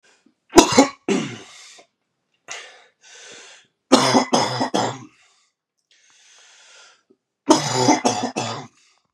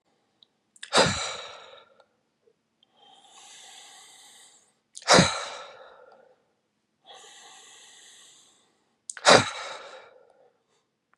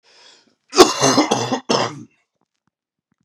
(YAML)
three_cough_length: 9.1 s
three_cough_amplitude: 32768
three_cough_signal_mean_std_ratio: 0.37
exhalation_length: 11.2 s
exhalation_amplitude: 32629
exhalation_signal_mean_std_ratio: 0.24
cough_length: 3.2 s
cough_amplitude: 32768
cough_signal_mean_std_ratio: 0.38
survey_phase: beta (2021-08-13 to 2022-03-07)
age: 18-44
gender: Male
wearing_mask: 'No'
symptom_cough_any: true
symptom_abdominal_pain: true
symptom_fatigue: true
symptom_headache: true
symptom_onset: 2 days
smoker_status: Never smoked
respiratory_condition_asthma: true
respiratory_condition_other: false
recruitment_source: Test and Trace
submission_delay: 1 day
covid_test_result: Positive
covid_test_method: RT-qPCR
covid_ct_value: 22.1
covid_ct_gene: N gene